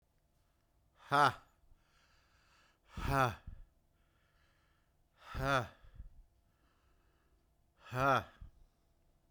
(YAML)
exhalation_length: 9.3 s
exhalation_amplitude: 5577
exhalation_signal_mean_std_ratio: 0.3
survey_phase: beta (2021-08-13 to 2022-03-07)
age: 45-64
gender: Male
wearing_mask: 'No'
symptom_cough_any: true
symptom_runny_or_blocked_nose: true
symptom_change_to_sense_of_smell_or_taste: true
smoker_status: Never smoked
respiratory_condition_asthma: false
respiratory_condition_other: false
recruitment_source: Test and Trace
submission_delay: 2 days
covid_test_result: Positive
covid_test_method: RT-qPCR
covid_ct_value: 19.8
covid_ct_gene: ORF1ab gene